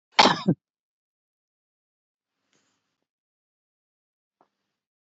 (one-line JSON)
{"cough_length": "5.1 s", "cough_amplitude": 26593, "cough_signal_mean_std_ratio": 0.16, "survey_phase": "beta (2021-08-13 to 2022-03-07)", "age": "65+", "gender": "Female", "wearing_mask": "No", "symptom_none": true, "smoker_status": "Never smoked", "respiratory_condition_asthma": false, "respiratory_condition_other": false, "recruitment_source": "REACT", "submission_delay": "2 days", "covid_test_result": "Negative", "covid_test_method": "RT-qPCR"}